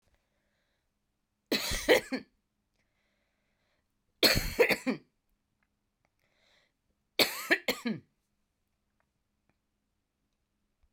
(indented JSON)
{
  "three_cough_length": "10.9 s",
  "three_cough_amplitude": 10891,
  "three_cough_signal_mean_std_ratio": 0.26,
  "survey_phase": "beta (2021-08-13 to 2022-03-07)",
  "age": "45-64",
  "gender": "Female",
  "wearing_mask": "No",
  "symptom_cough_any": true,
  "symptom_runny_or_blocked_nose": true,
  "symptom_headache": true,
  "symptom_other": true,
  "symptom_onset": "6 days",
  "smoker_status": "Never smoked",
  "respiratory_condition_asthma": false,
  "respiratory_condition_other": false,
  "recruitment_source": "Test and Trace",
  "submission_delay": "3 days",
  "covid_test_result": "Positive",
  "covid_test_method": "RT-qPCR"
}